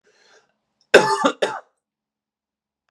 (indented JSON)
{
  "cough_length": "2.9 s",
  "cough_amplitude": 32768,
  "cough_signal_mean_std_ratio": 0.27,
  "survey_phase": "beta (2021-08-13 to 2022-03-07)",
  "age": "18-44",
  "gender": "Male",
  "wearing_mask": "No",
  "symptom_diarrhoea": true,
  "symptom_onset": "4 days",
  "smoker_status": "Ex-smoker",
  "respiratory_condition_asthma": false,
  "respiratory_condition_other": false,
  "recruitment_source": "Test and Trace",
  "submission_delay": "2 days",
  "covid_test_result": "Positive",
  "covid_test_method": "RT-qPCR",
  "covid_ct_value": 25.4,
  "covid_ct_gene": "N gene"
}